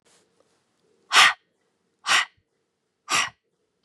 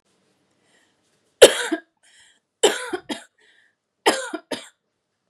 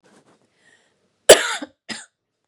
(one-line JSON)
{"exhalation_length": "3.8 s", "exhalation_amplitude": 27721, "exhalation_signal_mean_std_ratio": 0.28, "three_cough_length": "5.3 s", "three_cough_amplitude": 32768, "three_cough_signal_mean_std_ratio": 0.23, "cough_length": "2.5 s", "cough_amplitude": 32768, "cough_signal_mean_std_ratio": 0.2, "survey_phase": "beta (2021-08-13 to 2022-03-07)", "age": "18-44", "gender": "Female", "wearing_mask": "No", "symptom_cough_any": true, "symptom_runny_or_blocked_nose": true, "symptom_sore_throat": true, "symptom_onset": "2 days", "smoker_status": "Never smoked", "respiratory_condition_asthma": false, "respiratory_condition_other": false, "recruitment_source": "Test and Trace", "submission_delay": "1 day", "covid_test_result": "Positive", "covid_test_method": "ePCR"}